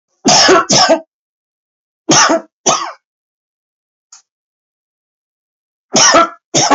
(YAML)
three_cough_length: 6.7 s
three_cough_amplitude: 32768
three_cough_signal_mean_std_ratio: 0.44
survey_phase: alpha (2021-03-01 to 2021-08-12)
age: 45-64
gender: Male
wearing_mask: 'No'
symptom_cough_any: true
symptom_onset: 2 days
smoker_status: Never smoked
respiratory_condition_asthma: false
respiratory_condition_other: false
recruitment_source: Test and Trace
submission_delay: 2 days
covid_test_result: Positive
covid_test_method: RT-qPCR
covid_ct_value: 16.3
covid_ct_gene: ORF1ab gene
covid_ct_mean: 16.8
covid_viral_load: 3000000 copies/ml
covid_viral_load_category: High viral load (>1M copies/ml)